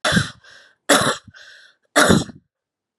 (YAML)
three_cough_length: 3.0 s
three_cough_amplitude: 31876
three_cough_signal_mean_std_ratio: 0.41
survey_phase: beta (2021-08-13 to 2022-03-07)
age: 18-44
gender: Female
wearing_mask: 'No'
symptom_runny_or_blocked_nose: true
symptom_fatigue: true
symptom_fever_high_temperature: true
symptom_headache: true
symptom_change_to_sense_of_smell_or_taste: true
smoker_status: Never smoked
respiratory_condition_asthma: false
respiratory_condition_other: false
recruitment_source: Test and Trace
submission_delay: 2 days
covid_test_result: Positive
covid_test_method: RT-qPCR
covid_ct_value: 21.6
covid_ct_gene: ORF1ab gene